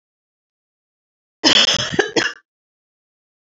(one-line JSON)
{"three_cough_length": "3.4 s", "three_cough_amplitude": 32768, "three_cough_signal_mean_std_ratio": 0.34, "survey_phase": "beta (2021-08-13 to 2022-03-07)", "age": "18-44", "gender": "Female", "wearing_mask": "No", "symptom_cough_any": true, "symptom_runny_or_blocked_nose": true, "symptom_fever_high_temperature": true, "symptom_headache": true, "symptom_loss_of_taste": true, "smoker_status": "Never smoked", "respiratory_condition_asthma": false, "respiratory_condition_other": false, "recruitment_source": "Test and Trace", "submission_delay": "3 days", "covid_test_result": "Positive", "covid_test_method": "RT-qPCR", "covid_ct_value": 32.4, "covid_ct_gene": "ORF1ab gene", "covid_ct_mean": 33.5, "covid_viral_load": "10 copies/ml", "covid_viral_load_category": "Minimal viral load (< 10K copies/ml)"}